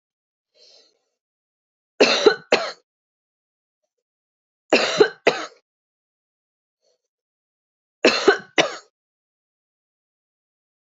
three_cough_length: 10.8 s
three_cough_amplitude: 32768
three_cough_signal_mean_std_ratio: 0.25
survey_phase: beta (2021-08-13 to 2022-03-07)
age: 45-64
gender: Female
wearing_mask: 'No'
symptom_cough_any: true
symptom_runny_or_blocked_nose: true
symptom_shortness_of_breath: true
symptom_sore_throat: true
symptom_fatigue: true
symptom_fever_high_temperature: true
symptom_headache: true
symptom_other: true
symptom_onset: 4 days
smoker_status: Never smoked
respiratory_condition_asthma: true
respiratory_condition_other: false
recruitment_source: Test and Trace
submission_delay: 2 days
covid_test_result: Positive
covid_test_method: RT-qPCR
covid_ct_value: 22.5
covid_ct_gene: ORF1ab gene
covid_ct_mean: 23.1
covid_viral_load: 26000 copies/ml
covid_viral_load_category: Low viral load (10K-1M copies/ml)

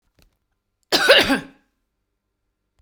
cough_length: 2.8 s
cough_amplitude: 32768
cough_signal_mean_std_ratio: 0.31
survey_phase: beta (2021-08-13 to 2022-03-07)
age: 45-64
gender: Female
wearing_mask: 'No'
symptom_none: true
smoker_status: Never smoked
respiratory_condition_asthma: false
respiratory_condition_other: false
recruitment_source: Test and Trace
submission_delay: 1 day
covid_test_result: Negative
covid_test_method: RT-qPCR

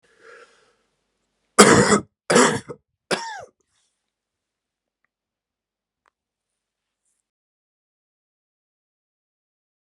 three_cough_length: 9.8 s
three_cough_amplitude: 32768
three_cough_signal_mean_std_ratio: 0.21
survey_phase: beta (2021-08-13 to 2022-03-07)
age: 18-44
gender: Male
wearing_mask: 'No'
symptom_cough_any: true
symptom_runny_or_blocked_nose: true
symptom_sore_throat: true
symptom_fatigue: true
symptom_fever_high_temperature: true
symptom_headache: true
symptom_loss_of_taste: true
symptom_onset: 7 days
smoker_status: Never smoked
respiratory_condition_asthma: false
respiratory_condition_other: false
recruitment_source: Test and Trace
submission_delay: 5 days
covid_test_result: Positive
covid_test_method: RT-qPCR
covid_ct_value: 13.8
covid_ct_gene: ORF1ab gene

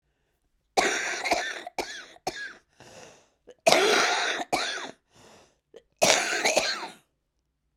cough_length: 7.8 s
cough_amplitude: 32768
cough_signal_mean_std_ratio: 0.48
survey_phase: beta (2021-08-13 to 2022-03-07)
age: 45-64
gender: Female
wearing_mask: 'Yes'
symptom_cough_any: true
symptom_runny_or_blocked_nose: true
symptom_shortness_of_breath: true
symptom_sore_throat: true
symptom_diarrhoea: true
symptom_fatigue: true
symptom_fever_high_temperature: true
symptom_headache: true
symptom_change_to_sense_of_smell_or_taste: true
symptom_loss_of_taste: true
symptom_other: true
symptom_onset: 4 days
smoker_status: Current smoker (11 or more cigarettes per day)
respiratory_condition_asthma: false
respiratory_condition_other: false
recruitment_source: Test and Trace
submission_delay: 2 days
covid_test_result: Positive
covid_test_method: RT-qPCR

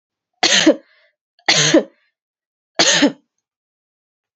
three_cough_length: 4.4 s
three_cough_amplitude: 32292
three_cough_signal_mean_std_ratio: 0.38
survey_phase: beta (2021-08-13 to 2022-03-07)
age: 45-64
gender: Female
wearing_mask: 'No'
symptom_cough_any: true
symptom_runny_or_blocked_nose: true
symptom_shortness_of_breath: true
symptom_sore_throat: true
symptom_fatigue: true
symptom_headache: true
smoker_status: Never smoked
respiratory_condition_asthma: false
respiratory_condition_other: false
recruitment_source: Test and Trace
submission_delay: 1 day
covid_test_result: Positive
covid_test_method: RT-qPCR
covid_ct_value: 22.1
covid_ct_gene: N gene
covid_ct_mean: 22.7
covid_viral_load: 35000 copies/ml
covid_viral_load_category: Low viral load (10K-1M copies/ml)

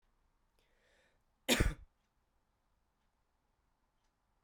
cough_length: 4.4 s
cough_amplitude: 5614
cough_signal_mean_std_ratio: 0.18
survey_phase: beta (2021-08-13 to 2022-03-07)
age: 18-44
gender: Male
wearing_mask: 'No'
symptom_cough_any: true
symptom_runny_or_blocked_nose: true
symptom_sore_throat: true
symptom_onset: 8 days
smoker_status: Prefer not to say
respiratory_condition_asthma: false
respiratory_condition_other: false
recruitment_source: Test and Trace
submission_delay: 2 days
covid_test_result: Positive
covid_test_method: RT-qPCR
covid_ct_value: 11.4
covid_ct_gene: ORF1ab gene
covid_ct_mean: 11.8
covid_viral_load: 130000000 copies/ml
covid_viral_load_category: High viral load (>1M copies/ml)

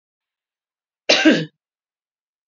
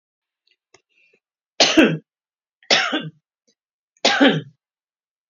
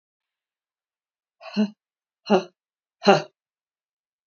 cough_length: 2.5 s
cough_amplitude: 29189
cough_signal_mean_std_ratio: 0.28
three_cough_length: 5.3 s
three_cough_amplitude: 29382
three_cough_signal_mean_std_ratio: 0.33
exhalation_length: 4.3 s
exhalation_amplitude: 27382
exhalation_signal_mean_std_ratio: 0.22
survey_phase: beta (2021-08-13 to 2022-03-07)
age: 65+
gender: Female
wearing_mask: 'No'
symptom_cough_any: true
symptom_runny_or_blocked_nose: true
symptom_onset: 10 days
smoker_status: Never smoked
respiratory_condition_asthma: false
respiratory_condition_other: false
recruitment_source: REACT
submission_delay: 3 days
covid_test_result: Negative
covid_test_method: RT-qPCR
influenza_a_test_result: Negative
influenza_b_test_result: Negative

